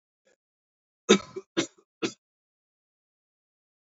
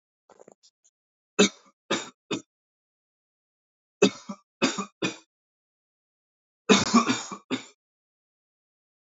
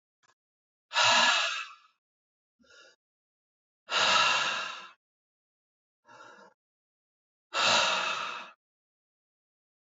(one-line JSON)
{"cough_length": "3.9 s", "cough_amplitude": 20606, "cough_signal_mean_std_ratio": 0.18, "three_cough_length": "9.1 s", "three_cough_amplitude": 18625, "three_cough_signal_mean_std_ratio": 0.26, "exhalation_length": "10.0 s", "exhalation_amplitude": 10572, "exhalation_signal_mean_std_ratio": 0.39, "survey_phase": "beta (2021-08-13 to 2022-03-07)", "age": "18-44", "gender": "Male", "wearing_mask": "No", "symptom_none": true, "smoker_status": "Never smoked", "respiratory_condition_asthma": false, "respiratory_condition_other": false, "recruitment_source": "REACT", "submission_delay": "3 days", "covid_test_result": "Negative", "covid_test_method": "RT-qPCR"}